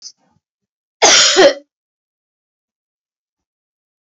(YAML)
cough_length: 4.2 s
cough_amplitude: 32768
cough_signal_mean_std_ratio: 0.29
survey_phase: beta (2021-08-13 to 2022-03-07)
age: 45-64
gender: Female
wearing_mask: 'No'
symptom_none: true
smoker_status: Never smoked
respiratory_condition_asthma: false
respiratory_condition_other: false
recruitment_source: REACT
submission_delay: 2 days
covid_test_result: Negative
covid_test_method: RT-qPCR
influenza_a_test_result: Unknown/Void
influenza_b_test_result: Unknown/Void